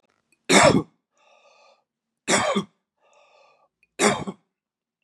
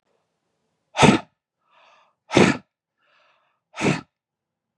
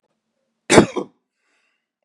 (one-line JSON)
{"three_cough_length": "5.0 s", "three_cough_amplitude": 27526, "three_cough_signal_mean_std_ratio": 0.32, "exhalation_length": "4.8 s", "exhalation_amplitude": 31737, "exhalation_signal_mean_std_ratio": 0.26, "cough_length": "2.0 s", "cough_amplitude": 32768, "cough_signal_mean_std_ratio": 0.23, "survey_phase": "beta (2021-08-13 to 2022-03-07)", "age": "45-64", "gender": "Male", "wearing_mask": "No", "symptom_none": true, "smoker_status": "Never smoked", "respiratory_condition_asthma": false, "respiratory_condition_other": false, "recruitment_source": "REACT", "submission_delay": "1 day", "covid_test_result": "Negative", "covid_test_method": "RT-qPCR", "influenza_a_test_result": "Negative", "influenza_b_test_result": "Negative"}